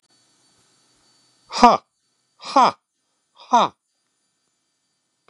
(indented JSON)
{
  "exhalation_length": "5.3 s",
  "exhalation_amplitude": 32768,
  "exhalation_signal_mean_std_ratio": 0.23,
  "survey_phase": "beta (2021-08-13 to 2022-03-07)",
  "age": "65+",
  "gender": "Male",
  "wearing_mask": "No",
  "symptom_none": true,
  "smoker_status": "Ex-smoker",
  "respiratory_condition_asthma": false,
  "respiratory_condition_other": false,
  "recruitment_source": "REACT",
  "submission_delay": "1 day",
  "covid_test_result": "Negative",
  "covid_test_method": "RT-qPCR",
  "influenza_a_test_result": "Negative",
  "influenza_b_test_result": "Negative"
}